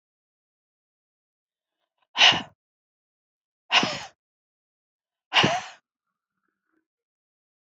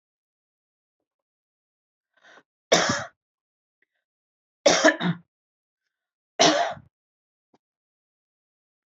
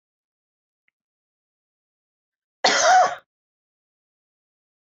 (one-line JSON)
{"exhalation_length": "7.7 s", "exhalation_amplitude": 21979, "exhalation_signal_mean_std_ratio": 0.23, "three_cough_length": "9.0 s", "three_cough_amplitude": 22046, "three_cough_signal_mean_std_ratio": 0.25, "cough_length": "4.9 s", "cough_amplitude": 20249, "cough_signal_mean_std_ratio": 0.25, "survey_phase": "beta (2021-08-13 to 2022-03-07)", "age": "45-64", "gender": "Female", "wearing_mask": "No", "symptom_cough_any": true, "symptom_runny_or_blocked_nose": true, "symptom_fatigue": true, "symptom_onset": "3 days", "smoker_status": "Never smoked", "respiratory_condition_asthma": false, "respiratory_condition_other": false, "recruitment_source": "Test and Trace", "submission_delay": "2 days", "covid_test_result": "Positive", "covid_test_method": "ePCR"}